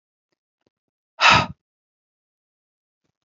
{"exhalation_length": "3.2 s", "exhalation_amplitude": 26925, "exhalation_signal_mean_std_ratio": 0.21, "survey_phase": "alpha (2021-03-01 to 2021-08-12)", "age": "45-64", "gender": "Female", "wearing_mask": "No", "symptom_none": true, "symptom_onset": "8 days", "smoker_status": "Never smoked", "respiratory_condition_asthma": false, "respiratory_condition_other": false, "recruitment_source": "REACT", "submission_delay": "4 days", "covid_test_result": "Negative", "covid_test_method": "RT-qPCR"}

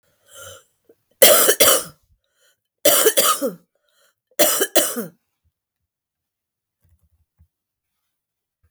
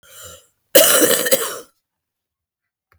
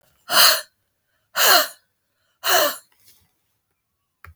{"three_cough_length": "8.7 s", "three_cough_amplitude": 32768, "three_cough_signal_mean_std_ratio": 0.33, "cough_length": "3.0 s", "cough_amplitude": 32768, "cough_signal_mean_std_ratio": 0.39, "exhalation_length": "4.4 s", "exhalation_amplitude": 32766, "exhalation_signal_mean_std_ratio": 0.36, "survey_phase": "beta (2021-08-13 to 2022-03-07)", "age": "45-64", "gender": "Male", "wearing_mask": "No", "symptom_cough_any": true, "symptom_runny_or_blocked_nose": true, "symptom_abdominal_pain": true, "symptom_fatigue": true, "symptom_headache": true, "symptom_change_to_sense_of_smell_or_taste": true, "symptom_loss_of_taste": true, "smoker_status": "Never smoked", "respiratory_condition_asthma": false, "respiratory_condition_other": false, "recruitment_source": "Test and Trace", "submission_delay": "5 days", "covid_test_result": "Positive", "covid_test_method": "RT-qPCR", "covid_ct_value": 14.9, "covid_ct_gene": "ORF1ab gene"}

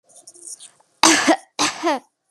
{"cough_length": "2.3 s", "cough_amplitude": 32767, "cough_signal_mean_std_ratio": 0.43, "survey_phase": "beta (2021-08-13 to 2022-03-07)", "age": "18-44", "gender": "Female", "wearing_mask": "No", "symptom_none": true, "smoker_status": "Never smoked", "respiratory_condition_asthma": false, "respiratory_condition_other": false, "recruitment_source": "REACT", "submission_delay": "2 days", "covid_test_result": "Negative", "covid_test_method": "RT-qPCR", "influenza_a_test_result": "Negative", "influenza_b_test_result": "Negative"}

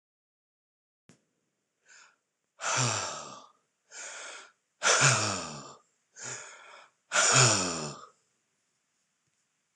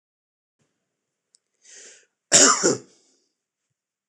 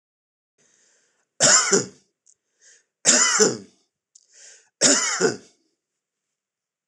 {"exhalation_length": "9.8 s", "exhalation_amplitude": 14625, "exhalation_signal_mean_std_ratio": 0.37, "cough_length": "4.1 s", "cough_amplitude": 26027, "cough_signal_mean_std_ratio": 0.25, "three_cough_length": "6.9 s", "three_cough_amplitude": 26028, "three_cough_signal_mean_std_ratio": 0.36, "survey_phase": "beta (2021-08-13 to 2022-03-07)", "age": "65+", "gender": "Male", "wearing_mask": "No", "symptom_none": true, "symptom_onset": "12 days", "smoker_status": "Ex-smoker", "respiratory_condition_asthma": false, "respiratory_condition_other": false, "recruitment_source": "REACT", "submission_delay": "2 days", "covid_test_result": "Negative", "covid_test_method": "RT-qPCR"}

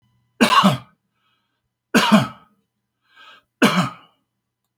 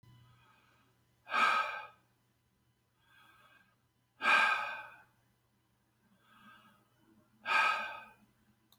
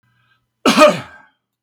{"three_cough_length": "4.8 s", "three_cough_amplitude": 29644, "three_cough_signal_mean_std_ratio": 0.35, "exhalation_length": "8.8 s", "exhalation_amplitude": 5220, "exhalation_signal_mean_std_ratio": 0.34, "cough_length": "1.6 s", "cough_amplitude": 32768, "cough_signal_mean_std_ratio": 0.36, "survey_phase": "beta (2021-08-13 to 2022-03-07)", "age": "65+", "gender": "Male", "wearing_mask": "No", "symptom_none": true, "smoker_status": "Ex-smoker", "respiratory_condition_asthma": false, "respiratory_condition_other": false, "recruitment_source": "REACT", "submission_delay": "3 days", "covid_test_result": "Negative", "covid_test_method": "RT-qPCR"}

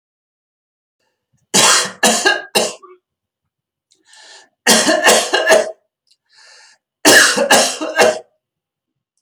{"three_cough_length": "9.2 s", "three_cough_amplitude": 32768, "three_cough_signal_mean_std_ratio": 0.45, "survey_phase": "beta (2021-08-13 to 2022-03-07)", "age": "65+", "gender": "Male", "wearing_mask": "No", "symptom_none": true, "smoker_status": "Never smoked", "respiratory_condition_asthma": false, "respiratory_condition_other": false, "recruitment_source": "REACT", "submission_delay": "2 days", "covid_test_result": "Negative", "covid_test_method": "RT-qPCR", "influenza_a_test_result": "Negative", "influenza_b_test_result": "Negative"}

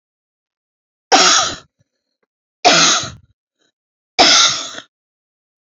{"three_cough_length": "5.6 s", "three_cough_amplitude": 32767, "three_cough_signal_mean_std_ratio": 0.39, "survey_phase": "beta (2021-08-13 to 2022-03-07)", "age": "45-64", "gender": "Female", "wearing_mask": "No", "symptom_none": true, "smoker_status": "Never smoked", "respiratory_condition_asthma": false, "respiratory_condition_other": false, "recruitment_source": "REACT", "submission_delay": "15 days", "covid_test_result": "Negative", "covid_test_method": "RT-qPCR", "influenza_a_test_result": "Negative", "influenza_b_test_result": "Negative"}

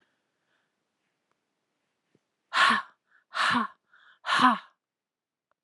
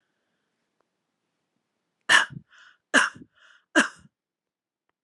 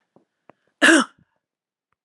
{"exhalation_length": "5.6 s", "exhalation_amplitude": 15115, "exhalation_signal_mean_std_ratio": 0.31, "three_cough_length": "5.0 s", "three_cough_amplitude": 22425, "three_cough_signal_mean_std_ratio": 0.22, "cough_length": "2.0 s", "cough_amplitude": 28831, "cough_signal_mean_std_ratio": 0.26, "survey_phase": "beta (2021-08-13 to 2022-03-07)", "age": "45-64", "gender": "Female", "wearing_mask": "No", "symptom_runny_or_blocked_nose": true, "smoker_status": "Ex-smoker", "respiratory_condition_asthma": false, "respiratory_condition_other": false, "recruitment_source": "REACT", "submission_delay": "1 day", "covid_test_result": "Negative", "covid_test_method": "RT-qPCR"}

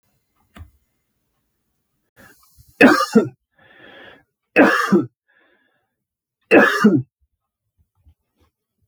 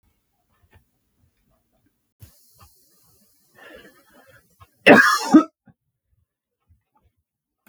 {"three_cough_length": "8.9 s", "three_cough_amplitude": 32768, "three_cough_signal_mean_std_ratio": 0.3, "cough_length": "7.7 s", "cough_amplitude": 32768, "cough_signal_mean_std_ratio": 0.2, "survey_phase": "beta (2021-08-13 to 2022-03-07)", "age": "18-44", "gender": "Male", "wearing_mask": "No", "symptom_none": true, "symptom_onset": "6 days", "smoker_status": "Ex-smoker", "respiratory_condition_asthma": false, "respiratory_condition_other": false, "recruitment_source": "REACT", "submission_delay": "3 days", "covid_test_result": "Negative", "covid_test_method": "RT-qPCR", "influenza_a_test_result": "Negative", "influenza_b_test_result": "Negative"}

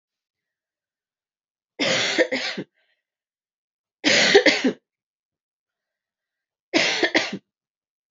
{"three_cough_length": "8.1 s", "three_cough_amplitude": 27658, "three_cough_signal_mean_std_ratio": 0.36, "survey_phase": "beta (2021-08-13 to 2022-03-07)", "age": "18-44", "gender": "Female", "wearing_mask": "No", "symptom_cough_any": true, "symptom_new_continuous_cough": true, "symptom_sore_throat": true, "symptom_fatigue": true, "symptom_headache": true, "symptom_onset": "3 days", "smoker_status": "Never smoked", "respiratory_condition_asthma": false, "respiratory_condition_other": false, "recruitment_source": "Test and Trace", "submission_delay": "1 day", "covid_test_result": "Positive", "covid_test_method": "ePCR"}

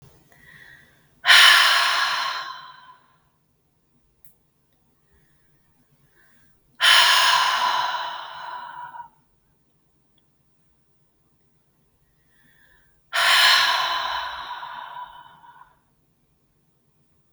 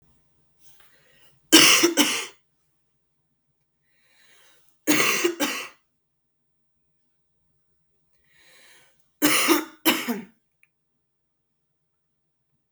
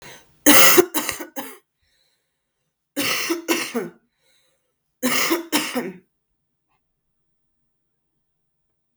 {"exhalation_length": "17.3 s", "exhalation_amplitude": 32768, "exhalation_signal_mean_std_ratio": 0.37, "three_cough_length": "12.7 s", "three_cough_amplitude": 32768, "three_cough_signal_mean_std_ratio": 0.3, "cough_length": "9.0 s", "cough_amplitude": 32768, "cough_signal_mean_std_ratio": 0.32, "survey_phase": "beta (2021-08-13 to 2022-03-07)", "age": "18-44", "gender": "Female", "wearing_mask": "No", "symptom_cough_any": true, "symptom_fatigue": true, "symptom_fever_high_temperature": true, "symptom_onset": "2 days", "smoker_status": "Never smoked", "respiratory_condition_asthma": true, "respiratory_condition_other": false, "recruitment_source": "Test and Trace", "submission_delay": "1 day", "covid_test_result": "Positive", "covid_test_method": "RT-qPCR"}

